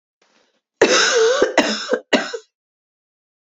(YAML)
cough_length: 3.4 s
cough_amplitude: 32768
cough_signal_mean_std_ratio: 0.5
survey_phase: beta (2021-08-13 to 2022-03-07)
age: 18-44
gender: Female
wearing_mask: 'No'
symptom_cough_any: true
symptom_new_continuous_cough: true
symptom_runny_or_blocked_nose: true
symptom_sore_throat: true
symptom_fever_high_temperature: true
symptom_headache: true
symptom_change_to_sense_of_smell_or_taste: true
symptom_loss_of_taste: true
symptom_onset: 3 days
smoker_status: Ex-smoker
respiratory_condition_asthma: false
respiratory_condition_other: false
recruitment_source: Test and Trace
submission_delay: 2 days
covid_test_result: Positive
covid_test_method: RT-qPCR
covid_ct_value: 23.0
covid_ct_gene: ORF1ab gene
covid_ct_mean: 23.6
covid_viral_load: 18000 copies/ml
covid_viral_load_category: Low viral load (10K-1M copies/ml)